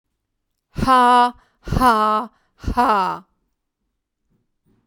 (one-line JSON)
{"exhalation_length": "4.9 s", "exhalation_amplitude": 22267, "exhalation_signal_mean_std_ratio": 0.45, "survey_phase": "beta (2021-08-13 to 2022-03-07)", "age": "65+", "gender": "Female", "wearing_mask": "No", "symptom_none": true, "smoker_status": "Ex-smoker", "respiratory_condition_asthma": false, "respiratory_condition_other": false, "recruitment_source": "REACT", "submission_delay": "1 day", "covid_test_result": "Negative", "covid_test_method": "RT-qPCR", "covid_ct_value": 40.0, "covid_ct_gene": "N gene"}